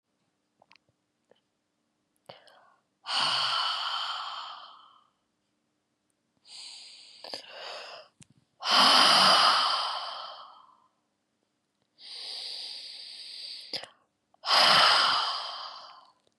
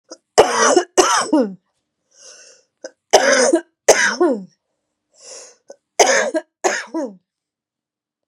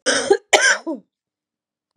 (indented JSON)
{
  "exhalation_length": "16.4 s",
  "exhalation_amplitude": 13925,
  "exhalation_signal_mean_std_ratio": 0.41,
  "three_cough_length": "8.3 s",
  "three_cough_amplitude": 32768,
  "three_cough_signal_mean_std_ratio": 0.44,
  "cough_length": "2.0 s",
  "cough_amplitude": 32248,
  "cough_signal_mean_std_ratio": 0.43,
  "survey_phase": "beta (2021-08-13 to 2022-03-07)",
  "age": "45-64",
  "gender": "Female",
  "wearing_mask": "No",
  "symptom_runny_or_blocked_nose": true,
  "symptom_fatigue": true,
  "symptom_fever_high_temperature": true,
  "symptom_headache": true,
  "smoker_status": "Ex-smoker",
  "respiratory_condition_asthma": true,
  "respiratory_condition_other": false,
  "recruitment_source": "Test and Trace",
  "submission_delay": "2 days",
  "covid_test_result": "Positive",
  "covid_test_method": "LFT"
}